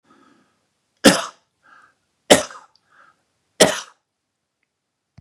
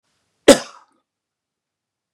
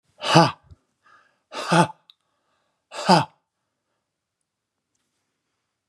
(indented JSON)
{
  "three_cough_length": "5.2 s",
  "three_cough_amplitude": 32768,
  "three_cough_signal_mean_std_ratio": 0.21,
  "cough_length": "2.1 s",
  "cough_amplitude": 32768,
  "cough_signal_mean_std_ratio": 0.16,
  "exhalation_length": "5.9 s",
  "exhalation_amplitude": 30230,
  "exhalation_signal_mean_std_ratio": 0.26,
  "survey_phase": "beta (2021-08-13 to 2022-03-07)",
  "age": "65+",
  "gender": "Male",
  "wearing_mask": "No",
  "symptom_none": true,
  "smoker_status": "Ex-smoker",
  "respiratory_condition_asthma": false,
  "respiratory_condition_other": false,
  "recruitment_source": "REACT",
  "submission_delay": "1 day",
  "covid_test_result": "Negative",
  "covid_test_method": "RT-qPCR",
  "influenza_a_test_result": "Negative",
  "influenza_b_test_result": "Negative"
}